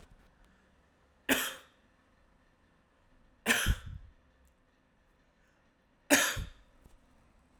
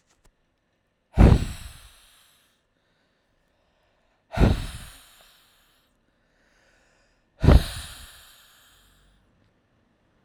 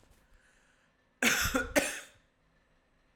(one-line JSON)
{"three_cough_length": "7.6 s", "three_cough_amplitude": 9880, "three_cough_signal_mean_std_ratio": 0.28, "exhalation_length": "10.2 s", "exhalation_amplitude": 29560, "exhalation_signal_mean_std_ratio": 0.22, "cough_length": "3.2 s", "cough_amplitude": 10697, "cough_signal_mean_std_ratio": 0.36, "survey_phase": "alpha (2021-03-01 to 2021-08-12)", "age": "18-44", "gender": "Male", "wearing_mask": "No", "symptom_cough_any": true, "symptom_fatigue": true, "symptom_headache": true, "symptom_onset": "3 days", "smoker_status": "Ex-smoker", "respiratory_condition_asthma": false, "respiratory_condition_other": false, "recruitment_source": "Test and Trace", "submission_delay": "2 days", "covid_test_result": "Positive", "covid_test_method": "RT-qPCR", "covid_ct_value": 26.3, "covid_ct_gene": "ORF1ab gene", "covid_ct_mean": 26.8, "covid_viral_load": "1600 copies/ml", "covid_viral_load_category": "Minimal viral load (< 10K copies/ml)"}